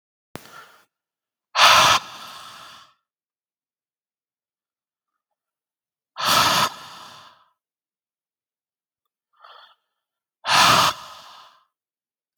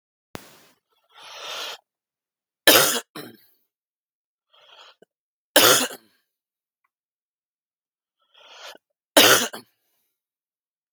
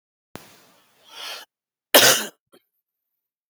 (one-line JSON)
{"exhalation_length": "12.4 s", "exhalation_amplitude": 32767, "exhalation_signal_mean_std_ratio": 0.29, "three_cough_length": "10.9 s", "three_cough_amplitude": 32768, "three_cough_signal_mean_std_ratio": 0.24, "cough_length": "3.5 s", "cough_amplitude": 32767, "cough_signal_mean_std_ratio": 0.24, "survey_phase": "beta (2021-08-13 to 2022-03-07)", "age": "45-64", "gender": "Male", "wearing_mask": "No", "symptom_none": true, "smoker_status": "Never smoked", "respiratory_condition_asthma": true, "respiratory_condition_other": false, "recruitment_source": "REACT", "submission_delay": "2 days", "covid_test_result": "Negative", "covid_test_method": "RT-qPCR", "influenza_a_test_result": "Negative", "influenza_b_test_result": "Negative"}